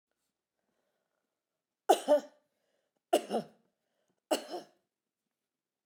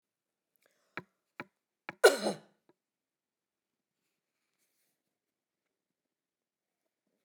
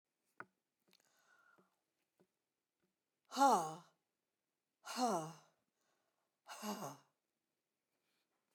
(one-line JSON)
{"three_cough_length": "5.9 s", "three_cough_amplitude": 9558, "three_cough_signal_mean_std_ratio": 0.22, "cough_length": "7.2 s", "cough_amplitude": 13649, "cough_signal_mean_std_ratio": 0.12, "exhalation_length": "8.5 s", "exhalation_amplitude": 2965, "exhalation_signal_mean_std_ratio": 0.25, "survey_phase": "beta (2021-08-13 to 2022-03-07)", "age": "65+", "gender": "Female", "wearing_mask": "No", "symptom_none": true, "smoker_status": "Never smoked", "respiratory_condition_asthma": false, "respiratory_condition_other": false, "recruitment_source": "REACT", "submission_delay": "1 day", "covid_test_result": "Negative", "covid_test_method": "RT-qPCR"}